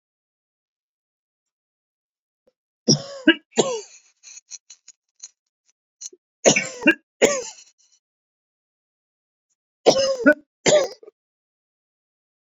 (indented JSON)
{
  "three_cough_length": "12.5 s",
  "three_cough_amplitude": 28969,
  "three_cough_signal_mean_std_ratio": 0.27,
  "survey_phase": "beta (2021-08-13 to 2022-03-07)",
  "age": "45-64",
  "gender": "Male",
  "wearing_mask": "No",
  "symptom_none": true,
  "smoker_status": "Ex-smoker",
  "respiratory_condition_asthma": false,
  "respiratory_condition_other": false,
  "recruitment_source": "REACT",
  "submission_delay": "2 days",
  "covid_test_result": "Negative",
  "covid_test_method": "RT-qPCR"
}